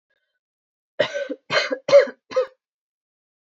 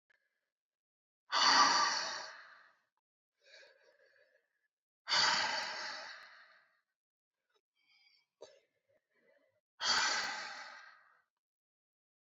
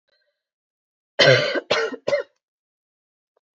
{
  "three_cough_length": "3.5 s",
  "three_cough_amplitude": 24970,
  "three_cough_signal_mean_std_ratio": 0.32,
  "exhalation_length": "12.2 s",
  "exhalation_amplitude": 5695,
  "exhalation_signal_mean_std_ratio": 0.35,
  "cough_length": "3.6 s",
  "cough_amplitude": 28886,
  "cough_signal_mean_std_ratio": 0.34,
  "survey_phase": "alpha (2021-03-01 to 2021-08-12)",
  "age": "18-44",
  "gender": "Female",
  "wearing_mask": "No",
  "symptom_fatigue": true,
  "symptom_fever_high_temperature": true,
  "symptom_headache": true,
  "symptom_change_to_sense_of_smell_or_taste": true,
  "symptom_loss_of_taste": true,
  "symptom_onset": "3 days",
  "smoker_status": "Never smoked",
  "respiratory_condition_asthma": false,
  "respiratory_condition_other": false,
  "recruitment_source": "Test and Trace",
  "submission_delay": "1 day",
  "covid_test_result": "Positive",
  "covid_test_method": "RT-qPCR",
  "covid_ct_value": 15.4,
  "covid_ct_gene": "ORF1ab gene",
  "covid_ct_mean": 15.8,
  "covid_viral_load": "6700000 copies/ml",
  "covid_viral_load_category": "High viral load (>1M copies/ml)"
}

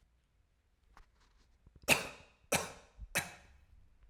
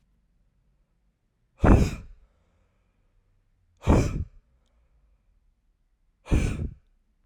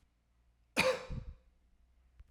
{
  "three_cough_length": "4.1 s",
  "three_cough_amplitude": 9629,
  "three_cough_signal_mean_std_ratio": 0.27,
  "exhalation_length": "7.3 s",
  "exhalation_amplitude": 23786,
  "exhalation_signal_mean_std_ratio": 0.28,
  "cough_length": "2.3 s",
  "cough_amplitude": 5390,
  "cough_signal_mean_std_ratio": 0.33,
  "survey_phase": "alpha (2021-03-01 to 2021-08-12)",
  "age": "18-44",
  "gender": "Male",
  "wearing_mask": "No",
  "symptom_fatigue": true,
  "symptom_change_to_sense_of_smell_or_taste": true,
  "symptom_loss_of_taste": true,
  "symptom_onset": "2 days",
  "smoker_status": "Never smoked",
  "respiratory_condition_asthma": false,
  "respiratory_condition_other": false,
  "recruitment_source": "Test and Trace",
  "submission_delay": "2 days",
  "covid_test_result": "Positive",
  "covid_test_method": "RT-qPCR",
  "covid_ct_value": 19.1,
  "covid_ct_gene": "N gene"
}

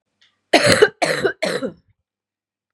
{
  "cough_length": "2.7 s",
  "cough_amplitude": 32768,
  "cough_signal_mean_std_ratio": 0.41,
  "survey_phase": "beta (2021-08-13 to 2022-03-07)",
  "age": "18-44",
  "gender": "Female",
  "wearing_mask": "No",
  "symptom_cough_any": true,
  "symptom_new_continuous_cough": true,
  "symptom_runny_or_blocked_nose": true,
  "symptom_shortness_of_breath": true,
  "symptom_sore_throat": true,
  "symptom_fatigue": true,
  "symptom_fever_high_temperature": true,
  "symptom_headache": true,
  "symptom_change_to_sense_of_smell_or_taste": true,
  "symptom_onset": "4 days",
  "smoker_status": "Ex-smoker",
  "respiratory_condition_asthma": false,
  "respiratory_condition_other": false,
  "recruitment_source": "Test and Trace",
  "submission_delay": "1 day",
  "covid_test_result": "Positive",
  "covid_test_method": "RT-qPCR",
  "covid_ct_value": 19.4,
  "covid_ct_gene": "N gene"
}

